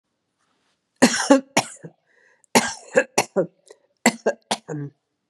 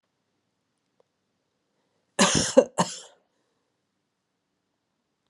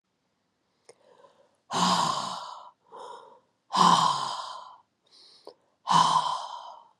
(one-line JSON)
{"three_cough_length": "5.3 s", "three_cough_amplitude": 32305, "three_cough_signal_mean_std_ratio": 0.32, "cough_length": "5.3 s", "cough_amplitude": 25728, "cough_signal_mean_std_ratio": 0.21, "exhalation_length": "7.0 s", "exhalation_amplitude": 16992, "exhalation_signal_mean_std_ratio": 0.44, "survey_phase": "beta (2021-08-13 to 2022-03-07)", "age": "65+", "gender": "Female", "wearing_mask": "No", "symptom_cough_any": true, "symptom_runny_or_blocked_nose": true, "symptom_onset": "7 days", "smoker_status": "Never smoked", "respiratory_condition_asthma": false, "respiratory_condition_other": false, "recruitment_source": "REACT", "submission_delay": "-2 days", "covid_test_result": "Negative", "covid_test_method": "RT-qPCR", "influenza_a_test_result": "Unknown/Void", "influenza_b_test_result": "Unknown/Void"}